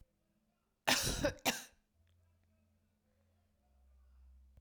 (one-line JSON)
{"cough_length": "4.6 s", "cough_amplitude": 6491, "cough_signal_mean_std_ratio": 0.29, "survey_phase": "beta (2021-08-13 to 2022-03-07)", "age": "18-44", "gender": "Female", "wearing_mask": "No", "symptom_cough_any": true, "symptom_new_continuous_cough": true, "symptom_runny_or_blocked_nose": true, "symptom_shortness_of_breath": true, "symptom_sore_throat": true, "symptom_fatigue": true, "symptom_headache": true, "symptom_onset": "3 days", "smoker_status": "Never smoked", "respiratory_condition_asthma": false, "respiratory_condition_other": false, "recruitment_source": "Test and Trace", "submission_delay": "1 day", "covid_test_result": "Positive", "covid_test_method": "RT-qPCR"}